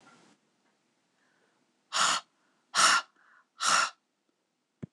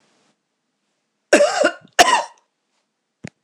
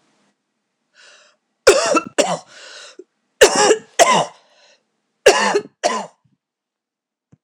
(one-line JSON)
{"exhalation_length": "4.9 s", "exhalation_amplitude": 11004, "exhalation_signal_mean_std_ratio": 0.33, "cough_length": "3.4 s", "cough_amplitude": 26028, "cough_signal_mean_std_ratio": 0.32, "three_cough_length": "7.4 s", "three_cough_amplitude": 26028, "three_cough_signal_mean_std_ratio": 0.36, "survey_phase": "beta (2021-08-13 to 2022-03-07)", "age": "45-64", "gender": "Female", "wearing_mask": "No", "symptom_runny_or_blocked_nose": true, "symptom_fatigue": true, "symptom_headache": true, "symptom_change_to_sense_of_smell_or_taste": true, "symptom_onset": "4 days", "smoker_status": "Never smoked", "respiratory_condition_asthma": false, "respiratory_condition_other": false, "recruitment_source": "Test and Trace", "submission_delay": "1 day", "covid_test_result": "Positive", "covid_test_method": "RT-qPCR", "covid_ct_value": 22.7, "covid_ct_gene": "ORF1ab gene"}